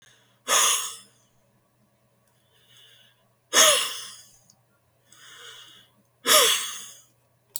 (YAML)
exhalation_length: 7.6 s
exhalation_amplitude: 23528
exhalation_signal_mean_std_ratio: 0.33
survey_phase: beta (2021-08-13 to 2022-03-07)
age: 65+
gender: Male
wearing_mask: 'No'
symptom_none: true
smoker_status: Never smoked
respiratory_condition_asthma: false
respiratory_condition_other: false
recruitment_source: REACT
submission_delay: 3 days
covid_test_result: Negative
covid_test_method: RT-qPCR
influenza_a_test_result: Negative
influenza_b_test_result: Negative